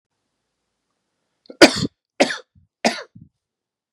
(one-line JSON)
{"three_cough_length": "3.9 s", "three_cough_amplitude": 32768, "three_cough_signal_mean_std_ratio": 0.21, "survey_phase": "beta (2021-08-13 to 2022-03-07)", "age": "45-64", "gender": "Male", "wearing_mask": "No", "symptom_none": true, "smoker_status": "Never smoked", "respiratory_condition_asthma": false, "respiratory_condition_other": false, "recruitment_source": "Test and Trace", "submission_delay": "1 day", "covid_test_result": "Negative", "covid_test_method": "ePCR"}